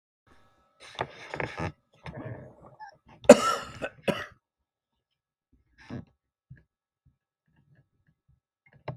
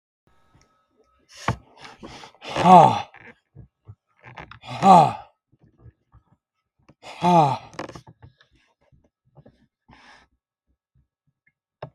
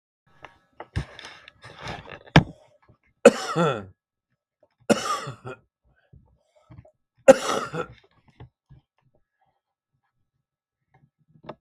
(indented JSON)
{
  "cough_length": "9.0 s",
  "cough_amplitude": 32768,
  "cough_signal_mean_std_ratio": 0.17,
  "exhalation_length": "11.9 s",
  "exhalation_amplitude": 32768,
  "exhalation_signal_mean_std_ratio": 0.25,
  "three_cough_length": "11.6 s",
  "three_cough_amplitude": 32768,
  "three_cough_signal_mean_std_ratio": 0.21,
  "survey_phase": "beta (2021-08-13 to 2022-03-07)",
  "age": "65+",
  "gender": "Male",
  "wearing_mask": "No",
  "symptom_cough_any": true,
  "symptom_runny_or_blocked_nose": true,
  "symptom_onset": "7 days",
  "smoker_status": "Never smoked",
  "respiratory_condition_asthma": false,
  "respiratory_condition_other": false,
  "recruitment_source": "REACT",
  "submission_delay": "2 days",
  "covid_test_result": "Negative",
  "covid_test_method": "RT-qPCR"
}